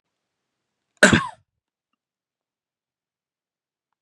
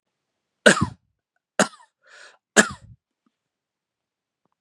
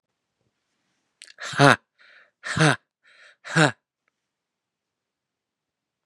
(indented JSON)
{
  "cough_length": "4.0 s",
  "cough_amplitude": 32767,
  "cough_signal_mean_std_ratio": 0.16,
  "three_cough_length": "4.6 s",
  "three_cough_amplitude": 32767,
  "three_cough_signal_mean_std_ratio": 0.19,
  "exhalation_length": "6.1 s",
  "exhalation_amplitude": 32767,
  "exhalation_signal_mean_std_ratio": 0.22,
  "survey_phase": "beta (2021-08-13 to 2022-03-07)",
  "age": "45-64",
  "gender": "Male",
  "wearing_mask": "No",
  "symptom_none": true,
  "smoker_status": "Never smoked",
  "respiratory_condition_asthma": false,
  "respiratory_condition_other": false,
  "recruitment_source": "Test and Trace",
  "submission_delay": "2 days",
  "covid_test_result": "Negative",
  "covid_test_method": "ePCR"
}